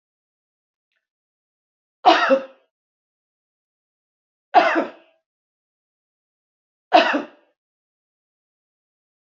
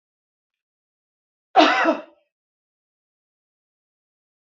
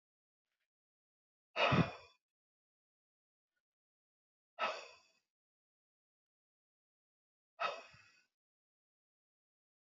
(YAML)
three_cough_length: 9.2 s
three_cough_amplitude: 28984
three_cough_signal_mean_std_ratio: 0.24
cough_length: 4.5 s
cough_amplitude: 26913
cough_signal_mean_std_ratio: 0.23
exhalation_length: 9.9 s
exhalation_amplitude: 4664
exhalation_signal_mean_std_ratio: 0.2
survey_phase: alpha (2021-03-01 to 2021-08-12)
age: 45-64
gender: Female
wearing_mask: 'No'
symptom_none: true
smoker_status: Ex-smoker
respiratory_condition_asthma: true
respiratory_condition_other: false
recruitment_source: REACT
submission_delay: 3 days
covid_test_result: Negative
covid_test_method: RT-qPCR